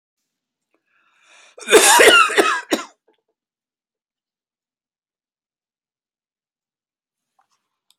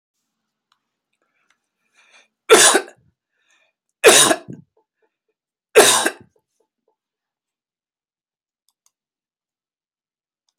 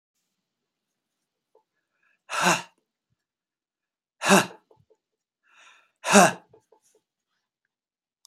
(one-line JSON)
{"cough_length": "8.0 s", "cough_amplitude": 32767, "cough_signal_mean_std_ratio": 0.26, "three_cough_length": "10.6 s", "three_cough_amplitude": 32768, "three_cough_signal_mean_std_ratio": 0.23, "exhalation_length": "8.3 s", "exhalation_amplitude": 29893, "exhalation_signal_mean_std_ratio": 0.21, "survey_phase": "beta (2021-08-13 to 2022-03-07)", "age": "65+", "gender": "Male", "wearing_mask": "No", "symptom_none": true, "smoker_status": "Never smoked", "respiratory_condition_asthma": false, "respiratory_condition_other": false, "recruitment_source": "REACT", "submission_delay": "1 day", "covid_test_result": "Negative", "covid_test_method": "RT-qPCR"}